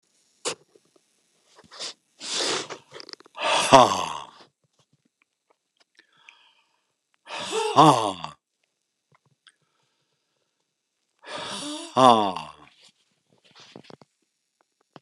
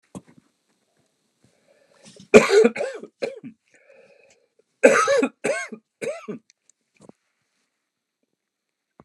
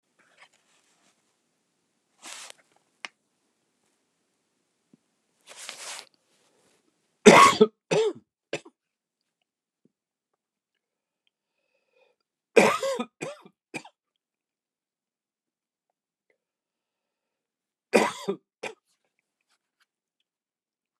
{"exhalation_length": "15.0 s", "exhalation_amplitude": 29204, "exhalation_signal_mean_std_ratio": 0.27, "cough_length": "9.0 s", "cough_amplitude": 29204, "cough_signal_mean_std_ratio": 0.27, "three_cough_length": "21.0 s", "three_cough_amplitude": 29204, "three_cough_signal_mean_std_ratio": 0.18, "survey_phase": "beta (2021-08-13 to 2022-03-07)", "age": "65+", "gender": "Male", "wearing_mask": "No", "symptom_new_continuous_cough": true, "symptom_runny_or_blocked_nose": true, "symptom_sore_throat": true, "symptom_fatigue": true, "symptom_headache": true, "symptom_onset": "3 days", "smoker_status": "Never smoked", "respiratory_condition_asthma": false, "respiratory_condition_other": false, "recruitment_source": "REACT", "submission_delay": "1 day", "covid_test_result": "Positive", "covid_test_method": "RT-qPCR", "covid_ct_value": 17.4, "covid_ct_gene": "E gene", "influenza_a_test_result": "Negative", "influenza_b_test_result": "Negative"}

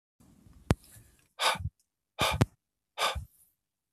{"exhalation_length": "3.9 s", "exhalation_amplitude": 18212, "exhalation_signal_mean_std_ratio": 0.32, "survey_phase": "beta (2021-08-13 to 2022-03-07)", "age": "45-64", "gender": "Male", "wearing_mask": "No", "symptom_none": true, "smoker_status": "Never smoked", "respiratory_condition_asthma": false, "respiratory_condition_other": false, "recruitment_source": "Test and Trace", "submission_delay": "1 day", "covid_test_result": "Negative", "covid_test_method": "RT-qPCR"}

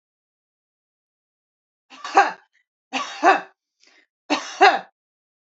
{"three_cough_length": "5.5 s", "three_cough_amplitude": 30289, "three_cough_signal_mean_std_ratio": 0.27, "survey_phase": "beta (2021-08-13 to 2022-03-07)", "age": "18-44", "gender": "Female", "wearing_mask": "No", "symptom_none": true, "smoker_status": "Ex-smoker", "respiratory_condition_asthma": false, "respiratory_condition_other": false, "recruitment_source": "Test and Trace", "submission_delay": "1 day", "covid_test_result": "Negative", "covid_test_method": "RT-qPCR"}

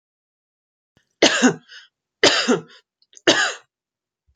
{"three_cough_length": "4.4 s", "three_cough_amplitude": 32413, "three_cough_signal_mean_std_ratio": 0.35, "survey_phase": "alpha (2021-03-01 to 2021-08-12)", "age": "18-44", "gender": "Female", "wearing_mask": "No", "symptom_none": true, "symptom_onset": "12 days", "smoker_status": "Never smoked", "respiratory_condition_asthma": false, "respiratory_condition_other": false, "recruitment_source": "REACT", "submission_delay": "1 day", "covid_test_result": "Negative", "covid_test_method": "RT-qPCR"}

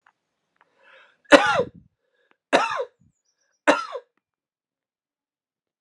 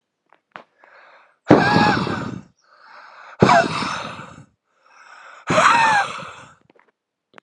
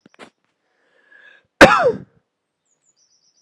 {"three_cough_length": "5.8 s", "three_cough_amplitude": 32768, "three_cough_signal_mean_std_ratio": 0.24, "exhalation_length": "7.4 s", "exhalation_amplitude": 32768, "exhalation_signal_mean_std_ratio": 0.42, "cough_length": "3.4 s", "cough_amplitude": 32768, "cough_signal_mean_std_ratio": 0.23, "survey_phase": "alpha (2021-03-01 to 2021-08-12)", "age": "18-44", "gender": "Male", "wearing_mask": "No", "symptom_headache": true, "symptom_change_to_sense_of_smell_or_taste": true, "symptom_onset": "5 days", "smoker_status": "Never smoked", "respiratory_condition_asthma": true, "respiratory_condition_other": false, "recruitment_source": "Test and Trace", "submission_delay": "2 days", "covid_test_result": "Positive", "covid_test_method": "RT-qPCR", "covid_ct_value": 17.1, "covid_ct_gene": "ORF1ab gene", "covid_ct_mean": 17.1, "covid_viral_load": "2500000 copies/ml", "covid_viral_load_category": "High viral load (>1M copies/ml)"}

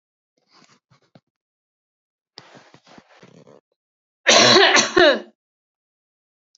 {"cough_length": "6.6 s", "cough_amplitude": 31030, "cough_signal_mean_std_ratio": 0.29, "survey_phase": "beta (2021-08-13 to 2022-03-07)", "age": "18-44", "gender": "Female", "wearing_mask": "No", "symptom_runny_or_blocked_nose": true, "smoker_status": "Never smoked", "respiratory_condition_asthma": false, "respiratory_condition_other": false, "recruitment_source": "Test and Trace", "submission_delay": "2 days", "covid_test_result": "Positive", "covid_test_method": "ePCR"}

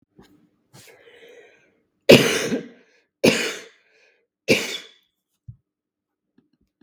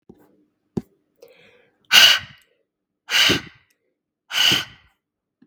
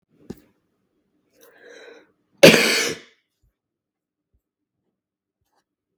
{"three_cough_length": "6.8 s", "three_cough_amplitude": 32768, "three_cough_signal_mean_std_ratio": 0.26, "exhalation_length": "5.5 s", "exhalation_amplitude": 32768, "exhalation_signal_mean_std_ratio": 0.31, "cough_length": "6.0 s", "cough_amplitude": 32768, "cough_signal_mean_std_ratio": 0.2, "survey_phase": "beta (2021-08-13 to 2022-03-07)", "age": "18-44", "gender": "Female", "wearing_mask": "No", "symptom_none": true, "smoker_status": "Never smoked", "respiratory_condition_asthma": false, "respiratory_condition_other": false, "recruitment_source": "REACT", "submission_delay": "5 days", "covid_test_result": "Negative", "covid_test_method": "RT-qPCR", "influenza_a_test_result": "Unknown/Void", "influenza_b_test_result": "Unknown/Void"}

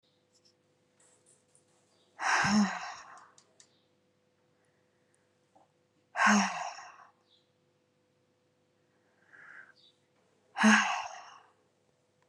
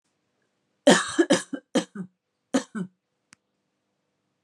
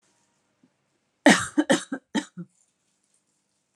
{"exhalation_length": "12.3 s", "exhalation_amplitude": 10149, "exhalation_signal_mean_std_ratio": 0.29, "cough_length": "4.4 s", "cough_amplitude": 31172, "cough_signal_mean_std_ratio": 0.28, "three_cough_length": "3.8 s", "three_cough_amplitude": 25150, "three_cough_signal_mean_std_ratio": 0.25, "survey_phase": "alpha (2021-03-01 to 2021-08-12)", "age": "45-64", "gender": "Female", "wearing_mask": "No", "symptom_none": true, "smoker_status": "Ex-smoker", "respiratory_condition_asthma": true, "respiratory_condition_other": false, "recruitment_source": "REACT", "submission_delay": "1 day", "covid_test_result": "Negative", "covid_test_method": "RT-qPCR"}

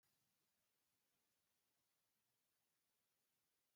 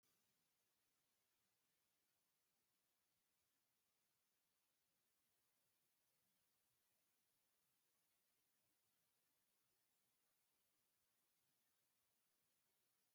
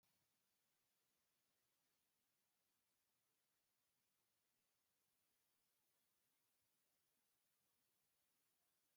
{"cough_length": "3.8 s", "cough_amplitude": 10, "cough_signal_mean_std_ratio": 0.84, "exhalation_length": "13.1 s", "exhalation_amplitude": 8, "exhalation_signal_mean_std_ratio": 0.88, "three_cough_length": "9.0 s", "three_cough_amplitude": 10, "three_cough_signal_mean_std_ratio": 0.87, "survey_phase": "beta (2021-08-13 to 2022-03-07)", "age": "65+", "gender": "Male", "wearing_mask": "No", "symptom_none": true, "smoker_status": "Ex-smoker", "respiratory_condition_asthma": false, "respiratory_condition_other": true, "recruitment_source": "REACT", "submission_delay": "1 day", "covid_test_result": "Negative", "covid_test_method": "RT-qPCR", "influenza_a_test_result": "Negative", "influenza_b_test_result": "Negative"}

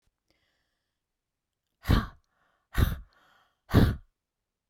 {"exhalation_length": "4.7 s", "exhalation_amplitude": 13691, "exhalation_signal_mean_std_ratio": 0.27, "survey_phase": "beta (2021-08-13 to 2022-03-07)", "age": "65+", "gender": "Female", "wearing_mask": "No", "symptom_none": true, "smoker_status": "Never smoked", "respiratory_condition_asthma": false, "respiratory_condition_other": false, "recruitment_source": "REACT", "submission_delay": "2 days", "covid_test_result": "Negative", "covid_test_method": "RT-qPCR"}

